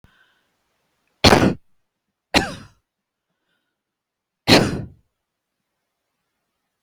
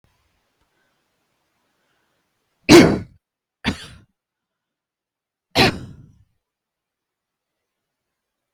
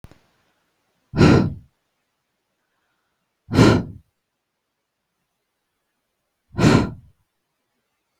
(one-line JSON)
{"cough_length": "6.8 s", "cough_amplitude": 32768, "cough_signal_mean_std_ratio": 0.24, "three_cough_length": "8.5 s", "three_cough_amplitude": 32768, "three_cough_signal_mean_std_ratio": 0.19, "exhalation_length": "8.2 s", "exhalation_amplitude": 32766, "exhalation_signal_mean_std_ratio": 0.27, "survey_phase": "beta (2021-08-13 to 2022-03-07)", "age": "45-64", "gender": "Female", "wearing_mask": "No", "symptom_none": true, "smoker_status": "Never smoked", "respiratory_condition_asthma": false, "respiratory_condition_other": false, "recruitment_source": "REACT", "submission_delay": "1 day", "covid_test_result": "Negative", "covid_test_method": "RT-qPCR"}